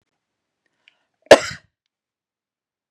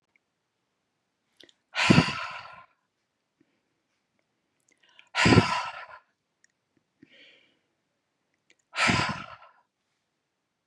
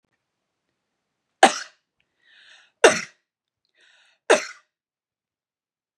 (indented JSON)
{
  "cough_length": "2.9 s",
  "cough_amplitude": 32768,
  "cough_signal_mean_std_ratio": 0.13,
  "exhalation_length": "10.7 s",
  "exhalation_amplitude": 21013,
  "exhalation_signal_mean_std_ratio": 0.26,
  "three_cough_length": "6.0 s",
  "three_cough_amplitude": 32767,
  "three_cough_signal_mean_std_ratio": 0.18,
  "survey_phase": "beta (2021-08-13 to 2022-03-07)",
  "age": "18-44",
  "gender": "Female",
  "wearing_mask": "No",
  "symptom_none": true,
  "smoker_status": "Ex-smoker",
  "respiratory_condition_asthma": false,
  "respiratory_condition_other": false,
  "recruitment_source": "Test and Trace",
  "submission_delay": "-1 day",
  "covid_test_result": "Negative",
  "covid_test_method": "LFT"
}